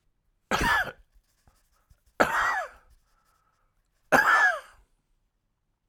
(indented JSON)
{
  "three_cough_length": "5.9 s",
  "three_cough_amplitude": 18886,
  "three_cough_signal_mean_std_ratio": 0.37,
  "survey_phase": "alpha (2021-03-01 to 2021-08-12)",
  "age": "65+",
  "gender": "Male",
  "wearing_mask": "No",
  "symptom_none": true,
  "smoker_status": "Ex-smoker",
  "respiratory_condition_asthma": false,
  "respiratory_condition_other": true,
  "recruitment_source": "REACT",
  "submission_delay": "1 day",
  "covid_test_result": "Negative",
  "covid_test_method": "RT-qPCR"
}